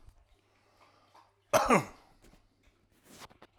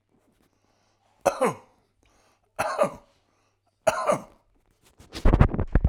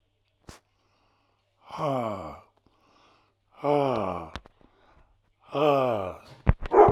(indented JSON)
{
  "cough_length": "3.6 s",
  "cough_amplitude": 9762,
  "cough_signal_mean_std_ratio": 0.25,
  "three_cough_length": "5.9 s",
  "three_cough_amplitude": 29356,
  "three_cough_signal_mean_std_ratio": 0.34,
  "exhalation_length": "6.9 s",
  "exhalation_amplitude": 21816,
  "exhalation_signal_mean_std_ratio": 0.37,
  "survey_phase": "alpha (2021-03-01 to 2021-08-12)",
  "age": "45-64",
  "gender": "Male",
  "wearing_mask": "No",
  "symptom_none": true,
  "smoker_status": "Ex-smoker",
  "respiratory_condition_asthma": false,
  "respiratory_condition_other": false,
  "recruitment_source": "REACT",
  "submission_delay": "2 days",
  "covid_test_result": "Negative",
  "covid_test_method": "RT-qPCR"
}